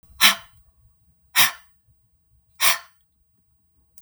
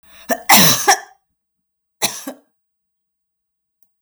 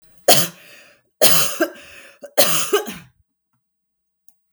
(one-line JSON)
{"exhalation_length": "4.0 s", "exhalation_amplitude": 32768, "exhalation_signal_mean_std_ratio": 0.27, "cough_length": "4.0 s", "cough_amplitude": 32768, "cough_signal_mean_std_ratio": 0.31, "three_cough_length": "4.5 s", "three_cough_amplitude": 32768, "three_cough_signal_mean_std_ratio": 0.39, "survey_phase": "beta (2021-08-13 to 2022-03-07)", "age": "45-64", "gender": "Female", "wearing_mask": "No", "symptom_cough_any": true, "smoker_status": "Never smoked", "respiratory_condition_asthma": false, "respiratory_condition_other": false, "recruitment_source": "Test and Trace", "submission_delay": "3 days", "covid_test_result": "Negative", "covid_test_method": "RT-qPCR"}